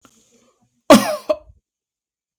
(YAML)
cough_length: 2.4 s
cough_amplitude: 32768
cough_signal_mean_std_ratio: 0.24
survey_phase: beta (2021-08-13 to 2022-03-07)
age: 18-44
gender: Male
wearing_mask: 'No'
symptom_none: true
smoker_status: Never smoked
respiratory_condition_asthma: false
respiratory_condition_other: false
recruitment_source: REACT
submission_delay: 1 day
covid_test_result: Negative
covid_test_method: RT-qPCR
influenza_a_test_result: Negative
influenza_b_test_result: Negative